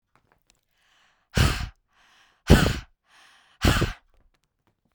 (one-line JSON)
{"exhalation_length": "4.9 s", "exhalation_amplitude": 29012, "exhalation_signal_mean_std_ratio": 0.3, "survey_phase": "beta (2021-08-13 to 2022-03-07)", "age": "18-44", "gender": "Female", "wearing_mask": "No", "symptom_cough_any": true, "symptom_runny_or_blocked_nose": true, "symptom_fatigue": true, "symptom_onset": "13 days", "smoker_status": "Never smoked", "respiratory_condition_asthma": false, "respiratory_condition_other": false, "recruitment_source": "REACT", "submission_delay": "1 day", "covid_test_result": "Negative", "covid_test_method": "RT-qPCR"}